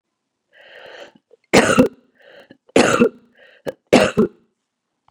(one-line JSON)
{"three_cough_length": "5.1 s", "three_cough_amplitude": 32768, "three_cough_signal_mean_std_ratio": 0.34, "survey_phase": "beta (2021-08-13 to 2022-03-07)", "age": "45-64", "gender": "Female", "wearing_mask": "No", "symptom_cough_any": true, "symptom_runny_or_blocked_nose": true, "symptom_headache": true, "symptom_onset": "4 days", "smoker_status": "Never smoked", "respiratory_condition_asthma": false, "respiratory_condition_other": false, "recruitment_source": "Test and Trace", "submission_delay": "2 days", "covid_test_result": "Positive", "covid_test_method": "ePCR"}